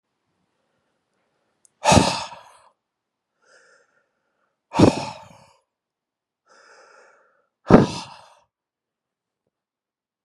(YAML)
exhalation_length: 10.2 s
exhalation_amplitude: 32768
exhalation_signal_mean_std_ratio: 0.21
survey_phase: beta (2021-08-13 to 2022-03-07)
age: 18-44
gender: Male
wearing_mask: 'No'
symptom_fatigue: true
smoker_status: Never smoked
respiratory_condition_asthma: false
respiratory_condition_other: false
recruitment_source: REACT
submission_delay: 3 days
covid_test_result: Negative
covid_test_method: RT-qPCR
influenza_a_test_result: Negative
influenza_b_test_result: Negative